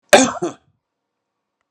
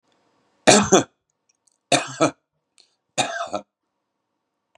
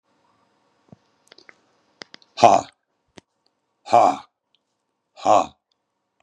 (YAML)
cough_length: 1.7 s
cough_amplitude: 32768
cough_signal_mean_std_ratio: 0.28
three_cough_length: 4.8 s
three_cough_amplitude: 32768
three_cough_signal_mean_std_ratio: 0.29
exhalation_length: 6.2 s
exhalation_amplitude: 32768
exhalation_signal_mean_std_ratio: 0.23
survey_phase: beta (2021-08-13 to 2022-03-07)
age: 65+
gender: Male
wearing_mask: 'No'
symptom_none: true
smoker_status: Ex-smoker
respiratory_condition_asthma: false
respiratory_condition_other: false
recruitment_source: Test and Trace
submission_delay: 1 day
covid_test_result: Negative
covid_test_method: ePCR